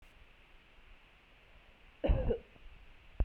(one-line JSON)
{"cough_length": "3.2 s", "cough_amplitude": 4503, "cough_signal_mean_std_ratio": 0.34, "survey_phase": "beta (2021-08-13 to 2022-03-07)", "age": "18-44", "gender": "Female", "wearing_mask": "No", "symptom_fever_high_temperature": true, "symptom_headache": true, "symptom_change_to_sense_of_smell_or_taste": true, "symptom_loss_of_taste": true, "symptom_onset": "3 days", "smoker_status": "Ex-smoker", "respiratory_condition_asthma": false, "respiratory_condition_other": false, "recruitment_source": "Test and Trace", "submission_delay": "2 days", "covid_test_result": "Positive", "covid_test_method": "RT-qPCR", "covid_ct_value": 17.5, "covid_ct_gene": "ORF1ab gene", "covid_ct_mean": 17.9, "covid_viral_load": "1300000 copies/ml", "covid_viral_load_category": "High viral load (>1M copies/ml)"}